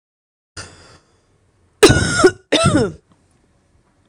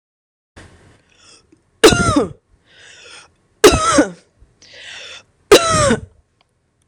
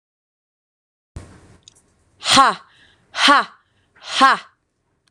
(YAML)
cough_length: 4.1 s
cough_amplitude: 26028
cough_signal_mean_std_ratio: 0.36
three_cough_length: 6.9 s
three_cough_amplitude: 26028
three_cough_signal_mean_std_ratio: 0.35
exhalation_length: 5.1 s
exhalation_amplitude: 26028
exhalation_signal_mean_std_ratio: 0.31
survey_phase: beta (2021-08-13 to 2022-03-07)
age: 18-44
gender: Female
wearing_mask: 'No'
symptom_none: true
smoker_status: Never smoked
respiratory_condition_asthma: false
respiratory_condition_other: false
recruitment_source: REACT
submission_delay: 7 days
covid_test_result: Negative
covid_test_method: RT-qPCR
influenza_a_test_result: Unknown/Void
influenza_b_test_result: Unknown/Void